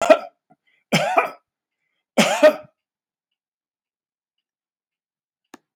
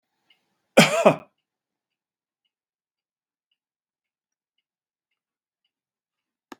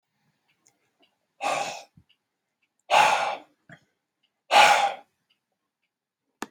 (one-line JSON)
{"three_cough_length": "5.8 s", "three_cough_amplitude": 32768, "three_cough_signal_mean_std_ratio": 0.27, "cough_length": "6.6 s", "cough_amplitude": 32765, "cough_signal_mean_std_ratio": 0.16, "exhalation_length": "6.5 s", "exhalation_amplitude": 21862, "exhalation_signal_mean_std_ratio": 0.31, "survey_phase": "beta (2021-08-13 to 2022-03-07)", "age": "65+", "gender": "Male", "wearing_mask": "No", "symptom_none": true, "smoker_status": "Ex-smoker", "respiratory_condition_asthma": false, "respiratory_condition_other": false, "recruitment_source": "REACT", "submission_delay": "1 day", "covid_test_result": "Negative", "covid_test_method": "RT-qPCR", "influenza_a_test_result": "Negative", "influenza_b_test_result": "Negative"}